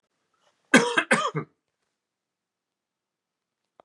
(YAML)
cough_length: 3.8 s
cough_amplitude: 26199
cough_signal_mean_std_ratio: 0.25
survey_phase: beta (2021-08-13 to 2022-03-07)
age: 45-64
gender: Male
wearing_mask: 'No'
symptom_cough_any: true
symptom_runny_or_blocked_nose: true
symptom_fatigue: true
symptom_change_to_sense_of_smell_or_taste: true
symptom_onset: 4 days
smoker_status: Never smoked
respiratory_condition_asthma: false
respiratory_condition_other: false
recruitment_source: Test and Trace
submission_delay: 2 days
covid_test_result: Positive
covid_test_method: RT-qPCR
covid_ct_value: 17.6
covid_ct_gene: ORF1ab gene
covid_ct_mean: 18.4
covid_viral_load: 890000 copies/ml
covid_viral_load_category: Low viral load (10K-1M copies/ml)